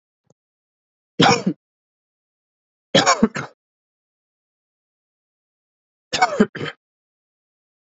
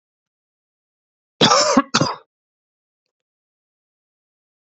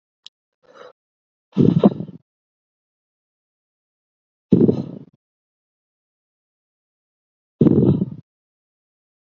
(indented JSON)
{
  "three_cough_length": "7.9 s",
  "three_cough_amplitude": 30510,
  "three_cough_signal_mean_std_ratio": 0.25,
  "cough_length": "4.6 s",
  "cough_amplitude": 31176,
  "cough_signal_mean_std_ratio": 0.27,
  "exhalation_length": "9.3 s",
  "exhalation_amplitude": 29125,
  "exhalation_signal_mean_std_ratio": 0.26,
  "survey_phase": "beta (2021-08-13 to 2022-03-07)",
  "age": "18-44",
  "gender": "Male",
  "wearing_mask": "No",
  "symptom_cough_any": true,
  "symptom_new_continuous_cough": true,
  "symptom_runny_or_blocked_nose": true,
  "symptom_shortness_of_breath": true,
  "symptom_diarrhoea": true,
  "symptom_fatigue": true,
  "symptom_fever_high_temperature": true,
  "symptom_headache": true,
  "symptom_change_to_sense_of_smell_or_taste": true,
  "symptom_onset": "2 days",
  "smoker_status": "Never smoked",
  "respiratory_condition_asthma": false,
  "respiratory_condition_other": false,
  "recruitment_source": "Test and Trace",
  "submission_delay": "1 day",
  "covid_test_result": "Positive",
  "covid_test_method": "RT-qPCR",
  "covid_ct_value": 13.4,
  "covid_ct_gene": "ORF1ab gene"
}